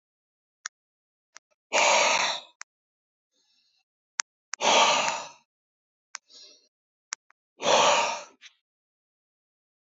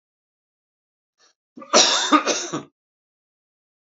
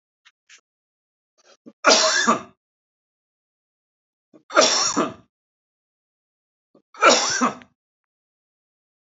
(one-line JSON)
{"exhalation_length": "9.9 s", "exhalation_amplitude": 19969, "exhalation_signal_mean_std_ratio": 0.34, "cough_length": "3.8 s", "cough_amplitude": 31175, "cough_signal_mean_std_ratio": 0.32, "three_cough_length": "9.1 s", "three_cough_amplitude": 30559, "three_cough_signal_mean_std_ratio": 0.31, "survey_phase": "alpha (2021-03-01 to 2021-08-12)", "age": "45-64", "gender": "Male", "wearing_mask": "No", "symptom_none": true, "smoker_status": "Ex-smoker", "respiratory_condition_asthma": false, "respiratory_condition_other": false, "recruitment_source": "REACT", "submission_delay": "3 days", "covid_test_result": "Negative", "covid_test_method": "RT-qPCR"}